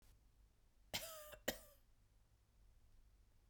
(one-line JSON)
{"cough_length": "3.5 s", "cough_amplitude": 1887, "cough_signal_mean_std_ratio": 0.37, "survey_phase": "beta (2021-08-13 to 2022-03-07)", "age": "45-64", "gender": "Female", "wearing_mask": "No", "symptom_none": true, "smoker_status": "Never smoked", "respiratory_condition_asthma": false, "respiratory_condition_other": false, "recruitment_source": "REACT", "submission_delay": "2 days", "covid_test_result": "Negative", "covid_test_method": "RT-qPCR", "influenza_a_test_result": "Negative", "influenza_b_test_result": "Negative"}